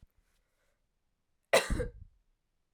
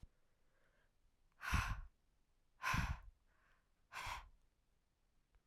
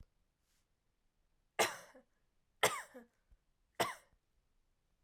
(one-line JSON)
{"cough_length": "2.7 s", "cough_amplitude": 7864, "cough_signal_mean_std_ratio": 0.24, "exhalation_length": "5.5 s", "exhalation_amplitude": 1903, "exhalation_signal_mean_std_ratio": 0.36, "three_cough_length": "5.0 s", "three_cough_amplitude": 5289, "three_cough_signal_mean_std_ratio": 0.23, "survey_phase": "alpha (2021-03-01 to 2021-08-12)", "age": "18-44", "gender": "Female", "wearing_mask": "No", "symptom_cough_any": true, "symptom_diarrhoea": true, "symptom_fatigue": true, "symptom_headache": true, "symptom_change_to_sense_of_smell_or_taste": true, "smoker_status": "Never smoked", "respiratory_condition_asthma": false, "respiratory_condition_other": false, "recruitment_source": "Test and Trace", "submission_delay": "2 days", "covid_test_result": "Positive", "covid_test_method": "RT-qPCR"}